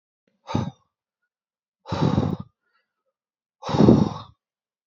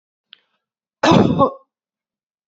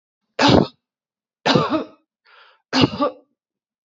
{"exhalation_length": "4.9 s", "exhalation_amplitude": 26303, "exhalation_signal_mean_std_ratio": 0.33, "cough_length": "2.5 s", "cough_amplitude": 27280, "cough_signal_mean_std_ratio": 0.34, "three_cough_length": "3.8 s", "three_cough_amplitude": 31849, "three_cough_signal_mean_std_ratio": 0.38, "survey_phase": "beta (2021-08-13 to 2022-03-07)", "age": "45-64", "gender": "Female", "wearing_mask": "No", "symptom_none": true, "smoker_status": "Never smoked", "respiratory_condition_asthma": false, "respiratory_condition_other": false, "recruitment_source": "REACT", "submission_delay": "3 days", "covid_test_result": "Negative", "covid_test_method": "RT-qPCR", "influenza_a_test_result": "Unknown/Void", "influenza_b_test_result": "Unknown/Void"}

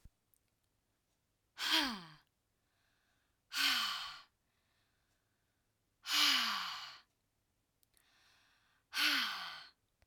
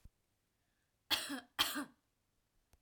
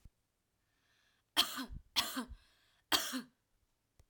{"exhalation_length": "10.1 s", "exhalation_amplitude": 4391, "exhalation_signal_mean_std_ratio": 0.37, "cough_length": "2.8 s", "cough_amplitude": 3742, "cough_signal_mean_std_ratio": 0.32, "three_cough_length": "4.1 s", "three_cough_amplitude": 6240, "three_cough_signal_mean_std_ratio": 0.33, "survey_phase": "beta (2021-08-13 to 2022-03-07)", "age": "18-44", "gender": "Female", "wearing_mask": "No", "symptom_runny_or_blocked_nose": true, "symptom_abdominal_pain": true, "symptom_diarrhoea": true, "symptom_fatigue": true, "symptom_headache": true, "symptom_change_to_sense_of_smell_or_taste": true, "smoker_status": "Never smoked", "respiratory_condition_asthma": false, "respiratory_condition_other": false, "recruitment_source": "Test and Trace", "submission_delay": "2 days", "covid_test_result": "Positive", "covid_test_method": "RT-qPCR", "covid_ct_value": 21.2, "covid_ct_gene": "ORF1ab gene"}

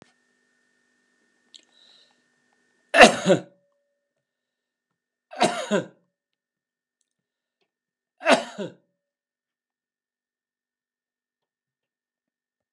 {"cough_length": "12.7 s", "cough_amplitude": 32768, "cough_signal_mean_std_ratio": 0.18, "survey_phase": "alpha (2021-03-01 to 2021-08-12)", "age": "65+", "gender": "Male", "wearing_mask": "No", "symptom_none": true, "smoker_status": "Never smoked", "respiratory_condition_asthma": false, "respiratory_condition_other": false, "recruitment_source": "REACT", "submission_delay": "5 days", "covid_test_result": "Negative", "covid_test_method": "RT-qPCR"}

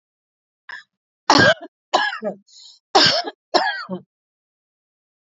{"cough_length": "5.4 s", "cough_amplitude": 29426, "cough_signal_mean_std_ratio": 0.35, "survey_phase": "alpha (2021-03-01 to 2021-08-12)", "age": "45-64", "gender": "Female", "wearing_mask": "No", "symptom_none": true, "smoker_status": "Never smoked", "respiratory_condition_asthma": true, "respiratory_condition_other": false, "recruitment_source": "REACT", "submission_delay": "3 days", "covid_test_result": "Negative", "covid_test_method": "RT-qPCR", "covid_ct_value": 46.0, "covid_ct_gene": "N gene"}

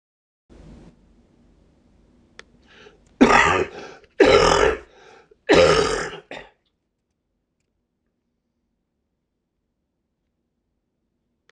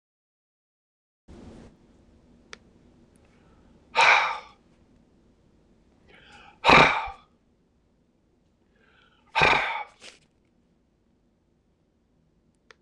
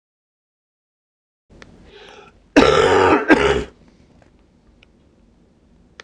{"three_cough_length": "11.5 s", "three_cough_amplitude": 26028, "three_cough_signal_mean_std_ratio": 0.3, "exhalation_length": "12.8 s", "exhalation_amplitude": 26028, "exhalation_signal_mean_std_ratio": 0.24, "cough_length": "6.0 s", "cough_amplitude": 26028, "cough_signal_mean_std_ratio": 0.34, "survey_phase": "beta (2021-08-13 to 2022-03-07)", "age": "65+", "gender": "Male", "wearing_mask": "No", "symptom_cough_any": true, "symptom_runny_or_blocked_nose": true, "symptom_shortness_of_breath": true, "symptom_fatigue": true, "symptom_headache": true, "symptom_onset": "8 days", "smoker_status": "Ex-smoker", "respiratory_condition_asthma": false, "respiratory_condition_other": true, "recruitment_source": "REACT", "submission_delay": "7 days", "covid_test_result": "Negative", "covid_test_method": "RT-qPCR"}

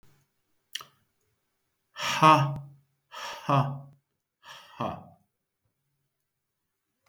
{"exhalation_length": "7.1 s", "exhalation_amplitude": 18056, "exhalation_signal_mean_std_ratio": 0.28, "survey_phase": "beta (2021-08-13 to 2022-03-07)", "age": "65+", "gender": "Male", "wearing_mask": "No", "symptom_none": true, "smoker_status": "Ex-smoker", "respiratory_condition_asthma": false, "respiratory_condition_other": false, "recruitment_source": "REACT", "submission_delay": "3 days", "covid_test_result": "Negative", "covid_test_method": "RT-qPCR", "influenza_a_test_result": "Negative", "influenza_b_test_result": "Negative"}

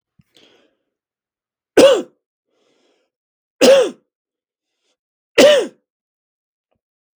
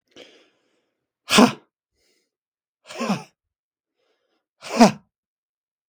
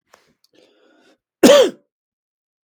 {"three_cough_length": "7.2 s", "three_cough_amplitude": 32768, "three_cough_signal_mean_std_ratio": 0.27, "exhalation_length": "5.9 s", "exhalation_amplitude": 32766, "exhalation_signal_mean_std_ratio": 0.22, "cough_length": "2.6 s", "cough_amplitude": 32768, "cough_signal_mean_std_ratio": 0.26, "survey_phase": "beta (2021-08-13 to 2022-03-07)", "age": "45-64", "gender": "Male", "wearing_mask": "No", "symptom_none": true, "smoker_status": "Ex-smoker", "respiratory_condition_asthma": false, "respiratory_condition_other": false, "recruitment_source": "Test and Trace", "submission_delay": "0 days", "covid_test_result": "Negative", "covid_test_method": "LFT"}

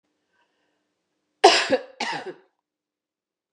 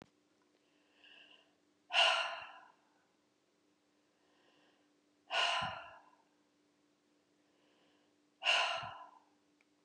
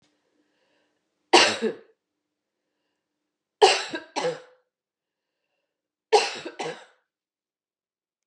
{"cough_length": "3.5 s", "cough_amplitude": 32653, "cough_signal_mean_std_ratio": 0.25, "exhalation_length": "9.8 s", "exhalation_amplitude": 4038, "exhalation_signal_mean_std_ratio": 0.31, "three_cough_length": "8.3 s", "three_cough_amplitude": 27235, "three_cough_signal_mean_std_ratio": 0.25, "survey_phase": "beta (2021-08-13 to 2022-03-07)", "age": "45-64", "gender": "Female", "wearing_mask": "No", "symptom_none": true, "smoker_status": "Never smoked", "respiratory_condition_asthma": false, "respiratory_condition_other": false, "recruitment_source": "REACT", "submission_delay": "2 days", "covid_test_result": "Negative", "covid_test_method": "RT-qPCR", "influenza_a_test_result": "Negative", "influenza_b_test_result": "Negative"}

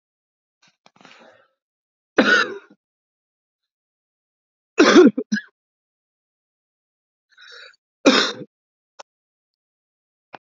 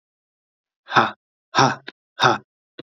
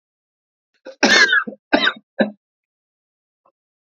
{"three_cough_length": "10.4 s", "three_cough_amplitude": 30647, "three_cough_signal_mean_std_ratio": 0.24, "exhalation_length": "2.9 s", "exhalation_amplitude": 27923, "exhalation_signal_mean_std_ratio": 0.31, "cough_length": "3.9 s", "cough_amplitude": 32768, "cough_signal_mean_std_ratio": 0.33, "survey_phase": "beta (2021-08-13 to 2022-03-07)", "age": "18-44", "gender": "Male", "wearing_mask": "No", "symptom_cough_any": true, "symptom_runny_or_blocked_nose": true, "symptom_shortness_of_breath": true, "symptom_sore_throat": true, "symptom_abdominal_pain": true, "symptom_fever_high_temperature": true, "symptom_headache": true, "symptom_onset": "3 days", "smoker_status": "Never smoked", "respiratory_condition_asthma": false, "respiratory_condition_other": false, "recruitment_source": "Test and Trace", "submission_delay": "1 day", "covid_test_result": "Positive", "covid_test_method": "RT-qPCR"}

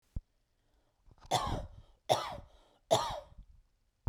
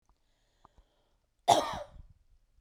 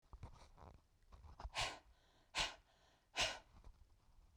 {"three_cough_length": "4.1 s", "three_cough_amplitude": 8193, "three_cough_signal_mean_std_ratio": 0.36, "cough_length": "2.6 s", "cough_amplitude": 12673, "cough_signal_mean_std_ratio": 0.24, "exhalation_length": "4.4 s", "exhalation_amplitude": 1735, "exhalation_signal_mean_std_ratio": 0.4, "survey_phase": "beta (2021-08-13 to 2022-03-07)", "age": "45-64", "gender": "Female", "wearing_mask": "No", "symptom_none": true, "smoker_status": "Ex-smoker", "respiratory_condition_asthma": false, "respiratory_condition_other": false, "recruitment_source": "REACT", "submission_delay": "3 days", "covid_test_result": "Negative", "covid_test_method": "RT-qPCR", "influenza_a_test_result": "Negative", "influenza_b_test_result": "Negative"}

